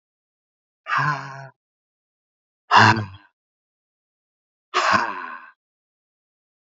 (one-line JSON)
{"exhalation_length": "6.7 s", "exhalation_amplitude": 27433, "exhalation_signal_mean_std_ratio": 0.3, "survey_phase": "beta (2021-08-13 to 2022-03-07)", "age": "45-64", "gender": "Male", "wearing_mask": "No", "symptom_cough_any": true, "symptom_runny_or_blocked_nose": true, "symptom_fatigue": true, "symptom_headache": true, "smoker_status": "Ex-smoker", "respiratory_condition_asthma": false, "respiratory_condition_other": false, "recruitment_source": "Test and Trace", "submission_delay": "2 days", "covid_test_result": "Positive", "covid_test_method": "ePCR"}